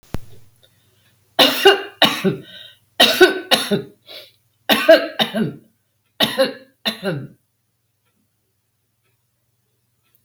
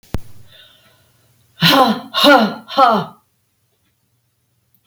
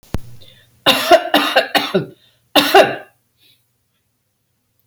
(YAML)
three_cough_length: 10.2 s
three_cough_amplitude: 32768
three_cough_signal_mean_std_ratio: 0.36
exhalation_length: 4.9 s
exhalation_amplitude: 32768
exhalation_signal_mean_std_ratio: 0.39
cough_length: 4.9 s
cough_amplitude: 32768
cough_signal_mean_std_ratio: 0.4
survey_phase: beta (2021-08-13 to 2022-03-07)
age: 45-64
gender: Female
wearing_mask: 'No'
symptom_runny_or_blocked_nose: true
symptom_sore_throat: true
symptom_onset: 3 days
smoker_status: Never smoked
respiratory_condition_asthma: false
respiratory_condition_other: false
recruitment_source: Test and Trace
submission_delay: 2 days
covid_test_result: Positive
covid_test_method: RT-qPCR
covid_ct_value: 27.4
covid_ct_gene: ORF1ab gene
covid_ct_mean: 27.9
covid_viral_load: 700 copies/ml
covid_viral_load_category: Minimal viral load (< 10K copies/ml)